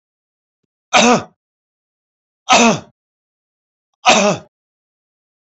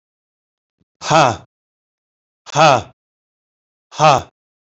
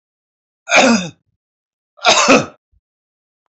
{
  "three_cough_length": "5.5 s",
  "three_cough_amplitude": 31157,
  "three_cough_signal_mean_std_ratio": 0.31,
  "exhalation_length": "4.8 s",
  "exhalation_amplitude": 32767,
  "exhalation_signal_mean_std_ratio": 0.3,
  "cough_length": "3.5 s",
  "cough_amplitude": 31411,
  "cough_signal_mean_std_ratio": 0.38,
  "survey_phase": "beta (2021-08-13 to 2022-03-07)",
  "age": "65+",
  "gender": "Male",
  "wearing_mask": "No",
  "symptom_none": true,
  "smoker_status": "Ex-smoker",
  "respiratory_condition_asthma": false,
  "respiratory_condition_other": false,
  "recruitment_source": "REACT",
  "submission_delay": "2 days",
  "covid_test_result": "Negative",
  "covid_test_method": "RT-qPCR",
  "influenza_a_test_result": "Negative",
  "influenza_b_test_result": "Negative"
}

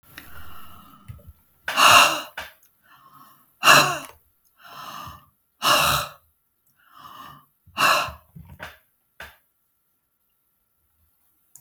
{
  "exhalation_length": "11.6 s",
  "exhalation_amplitude": 32768,
  "exhalation_signal_mean_std_ratio": 0.31,
  "survey_phase": "beta (2021-08-13 to 2022-03-07)",
  "age": "45-64",
  "gender": "Female",
  "wearing_mask": "No",
  "symptom_none": true,
  "smoker_status": "Never smoked",
  "respiratory_condition_asthma": false,
  "respiratory_condition_other": false,
  "recruitment_source": "REACT",
  "submission_delay": "1 day",
  "covid_test_result": "Negative",
  "covid_test_method": "RT-qPCR"
}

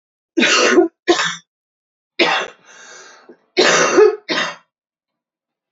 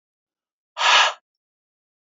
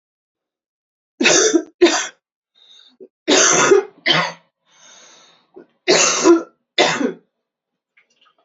{
  "cough_length": "5.7 s",
  "cough_amplitude": 30189,
  "cough_signal_mean_std_ratio": 0.46,
  "exhalation_length": "2.1 s",
  "exhalation_amplitude": 23993,
  "exhalation_signal_mean_std_ratio": 0.31,
  "three_cough_length": "8.4 s",
  "three_cough_amplitude": 32440,
  "three_cough_signal_mean_std_ratio": 0.43,
  "survey_phase": "beta (2021-08-13 to 2022-03-07)",
  "age": "45-64",
  "gender": "Female",
  "wearing_mask": "No",
  "symptom_cough_any": true,
  "symptom_runny_or_blocked_nose": true,
  "symptom_sore_throat": true,
  "symptom_fatigue": true,
  "symptom_headache": true,
  "symptom_change_to_sense_of_smell_or_taste": true,
  "symptom_loss_of_taste": true,
  "symptom_other": true,
  "symptom_onset": "5 days",
  "smoker_status": "Ex-smoker",
  "respiratory_condition_asthma": false,
  "respiratory_condition_other": false,
  "recruitment_source": "Test and Trace",
  "submission_delay": "1 day",
  "covid_test_result": "Positive",
  "covid_test_method": "RT-qPCR"
}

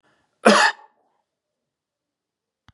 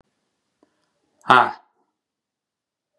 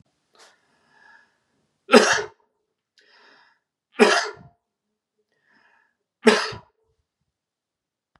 {
  "cough_length": "2.7 s",
  "cough_amplitude": 31215,
  "cough_signal_mean_std_ratio": 0.24,
  "exhalation_length": "3.0 s",
  "exhalation_amplitude": 32767,
  "exhalation_signal_mean_std_ratio": 0.18,
  "three_cough_length": "8.2 s",
  "three_cough_amplitude": 32512,
  "three_cough_signal_mean_std_ratio": 0.23,
  "survey_phase": "beta (2021-08-13 to 2022-03-07)",
  "age": "45-64",
  "gender": "Male",
  "wearing_mask": "No",
  "symptom_none": true,
  "smoker_status": "Never smoked",
  "respiratory_condition_asthma": true,
  "respiratory_condition_other": false,
  "recruitment_source": "REACT",
  "submission_delay": "2 days",
  "covid_test_result": "Negative",
  "covid_test_method": "RT-qPCR",
  "influenza_a_test_result": "Negative",
  "influenza_b_test_result": "Negative"
}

